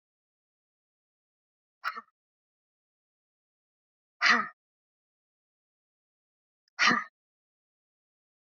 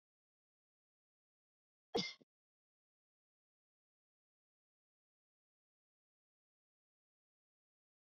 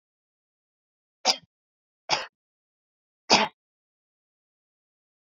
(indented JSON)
{
  "exhalation_length": "8.5 s",
  "exhalation_amplitude": 10224,
  "exhalation_signal_mean_std_ratio": 0.19,
  "cough_length": "8.1 s",
  "cough_amplitude": 2055,
  "cough_signal_mean_std_ratio": 0.11,
  "three_cough_length": "5.4 s",
  "three_cough_amplitude": 22011,
  "three_cough_signal_mean_std_ratio": 0.19,
  "survey_phase": "beta (2021-08-13 to 2022-03-07)",
  "age": "45-64",
  "gender": "Female",
  "wearing_mask": "No",
  "symptom_none": true,
  "smoker_status": "Never smoked",
  "respiratory_condition_asthma": false,
  "respiratory_condition_other": false,
  "recruitment_source": "REACT",
  "submission_delay": "1 day",
  "covid_test_result": "Negative",
  "covid_test_method": "RT-qPCR",
  "influenza_a_test_result": "Negative",
  "influenza_b_test_result": "Negative"
}